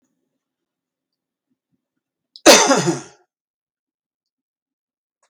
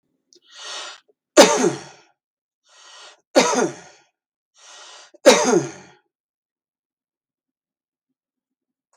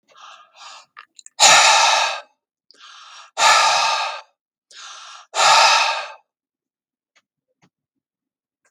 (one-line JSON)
{"cough_length": "5.3 s", "cough_amplitude": 32768, "cough_signal_mean_std_ratio": 0.22, "three_cough_length": "9.0 s", "three_cough_amplitude": 32768, "three_cough_signal_mean_std_ratio": 0.27, "exhalation_length": "8.7 s", "exhalation_amplitude": 32768, "exhalation_signal_mean_std_ratio": 0.42, "survey_phase": "beta (2021-08-13 to 2022-03-07)", "age": "65+", "gender": "Male", "wearing_mask": "No", "symptom_none": true, "smoker_status": "Ex-smoker", "respiratory_condition_asthma": false, "respiratory_condition_other": false, "recruitment_source": "REACT", "submission_delay": "2 days", "covid_test_result": "Negative", "covid_test_method": "RT-qPCR", "influenza_a_test_result": "Negative", "influenza_b_test_result": "Negative"}